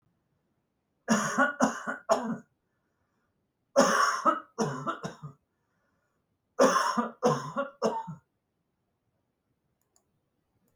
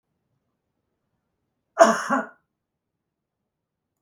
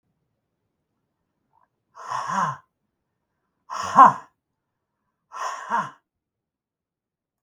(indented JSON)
{
  "three_cough_length": "10.8 s",
  "three_cough_amplitude": 14339,
  "three_cough_signal_mean_std_ratio": 0.4,
  "cough_length": "4.0 s",
  "cough_amplitude": 32654,
  "cough_signal_mean_std_ratio": 0.21,
  "exhalation_length": "7.4 s",
  "exhalation_amplitude": 32766,
  "exhalation_signal_mean_std_ratio": 0.23,
  "survey_phase": "beta (2021-08-13 to 2022-03-07)",
  "age": "65+",
  "gender": "Male",
  "wearing_mask": "No",
  "symptom_none": true,
  "smoker_status": "Never smoked",
  "respiratory_condition_asthma": false,
  "respiratory_condition_other": false,
  "recruitment_source": "REACT",
  "submission_delay": "2 days",
  "covid_test_result": "Negative",
  "covid_test_method": "RT-qPCR",
  "influenza_a_test_result": "Negative",
  "influenza_b_test_result": "Negative"
}